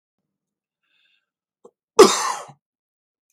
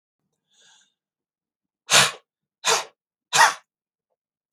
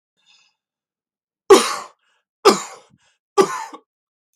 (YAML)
cough_length: 3.3 s
cough_amplitude: 32768
cough_signal_mean_std_ratio: 0.2
exhalation_length: 4.5 s
exhalation_amplitude: 30630
exhalation_signal_mean_std_ratio: 0.27
three_cough_length: 4.4 s
three_cough_amplitude: 32768
three_cough_signal_mean_std_ratio: 0.25
survey_phase: beta (2021-08-13 to 2022-03-07)
age: 18-44
gender: Male
wearing_mask: 'No'
symptom_none: true
smoker_status: Never smoked
respiratory_condition_asthma: false
respiratory_condition_other: false
recruitment_source: REACT
submission_delay: 2 days
covid_test_result: Negative
covid_test_method: RT-qPCR
influenza_a_test_result: Negative
influenza_b_test_result: Negative